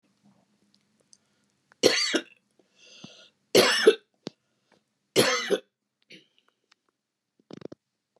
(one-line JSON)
{"three_cough_length": "8.2 s", "three_cough_amplitude": 21917, "three_cough_signal_mean_std_ratio": 0.27, "survey_phase": "beta (2021-08-13 to 2022-03-07)", "age": "65+", "gender": "Female", "wearing_mask": "No", "symptom_cough_any": true, "smoker_status": "Ex-smoker", "respiratory_condition_asthma": false, "respiratory_condition_other": false, "recruitment_source": "REACT", "submission_delay": "2 days", "covid_test_result": "Negative", "covid_test_method": "RT-qPCR", "influenza_a_test_result": "Negative", "influenza_b_test_result": "Negative"}